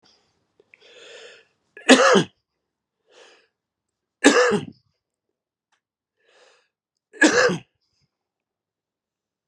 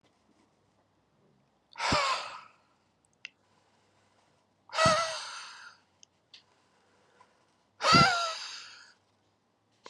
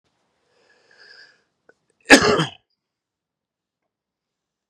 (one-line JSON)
{"three_cough_length": "9.5 s", "three_cough_amplitude": 32766, "three_cough_signal_mean_std_ratio": 0.26, "exhalation_length": "9.9 s", "exhalation_amplitude": 12957, "exhalation_signal_mean_std_ratio": 0.31, "cough_length": "4.7 s", "cough_amplitude": 32768, "cough_signal_mean_std_ratio": 0.19, "survey_phase": "beta (2021-08-13 to 2022-03-07)", "age": "45-64", "gender": "Male", "wearing_mask": "No", "symptom_cough_any": true, "symptom_runny_or_blocked_nose": true, "symptom_fatigue": true, "symptom_headache": true, "symptom_change_to_sense_of_smell_or_taste": true, "symptom_loss_of_taste": true, "symptom_onset": "5 days", "smoker_status": "Ex-smoker", "respiratory_condition_asthma": false, "respiratory_condition_other": false, "recruitment_source": "Test and Trace", "submission_delay": "2 days", "covid_test_result": "Positive", "covid_test_method": "RT-qPCR", "covid_ct_value": 13.9, "covid_ct_gene": "ORF1ab gene", "covid_ct_mean": 14.5, "covid_viral_load": "18000000 copies/ml", "covid_viral_load_category": "High viral load (>1M copies/ml)"}